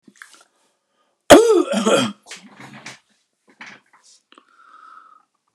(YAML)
cough_length: 5.5 s
cough_amplitude: 32768
cough_signal_mean_std_ratio: 0.28
survey_phase: beta (2021-08-13 to 2022-03-07)
age: 65+
gender: Male
wearing_mask: 'No'
symptom_none: true
smoker_status: Ex-smoker
respiratory_condition_asthma: false
respiratory_condition_other: false
recruitment_source: REACT
submission_delay: 2 days
covid_test_result: Negative
covid_test_method: RT-qPCR